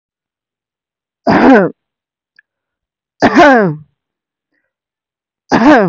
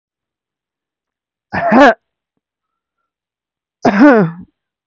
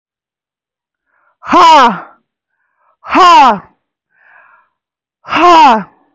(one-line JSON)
{"three_cough_length": "5.9 s", "three_cough_amplitude": 32768, "three_cough_signal_mean_std_ratio": 0.4, "cough_length": "4.9 s", "cough_amplitude": 32768, "cough_signal_mean_std_ratio": 0.34, "exhalation_length": "6.1 s", "exhalation_amplitude": 32768, "exhalation_signal_mean_std_ratio": 0.45, "survey_phase": "beta (2021-08-13 to 2022-03-07)", "age": "18-44", "gender": "Female", "wearing_mask": "No", "symptom_none": true, "smoker_status": "Never smoked", "respiratory_condition_asthma": false, "respiratory_condition_other": false, "recruitment_source": "REACT", "submission_delay": "1 day", "covid_test_result": "Negative", "covid_test_method": "RT-qPCR", "influenza_a_test_result": "Negative", "influenza_b_test_result": "Negative"}